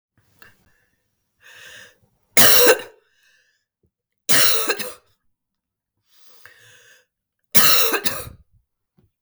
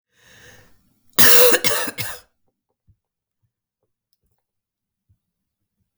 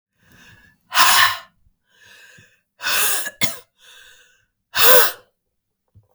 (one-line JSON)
{"three_cough_length": "9.2 s", "three_cough_amplitude": 32768, "three_cough_signal_mean_std_ratio": 0.32, "cough_length": "6.0 s", "cough_amplitude": 32768, "cough_signal_mean_std_ratio": 0.27, "exhalation_length": "6.1 s", "exhalation_amplitude": 32768, "exhalation_signal_mean_std_ratio": 0.36, "survey_phase": "beta (2021-08-13 to 2022-03-07)", "age": "45-64", "gender": "Female", "wearing_mask": "No", "symptom_cough_any": true, "symptom_runny_or_blocked_nose": true, "symptom_headache": true, "symptom_onset": "7 days", "smoker_status": "Never smoked", "respiratory_condition_asthma": false, "respiratory_condition_other": false, "recruitment_source": "REACT", "submission_delay": "2 days", "covid_test_result": "Negative", "covid_test_method": "RT-qPCR"}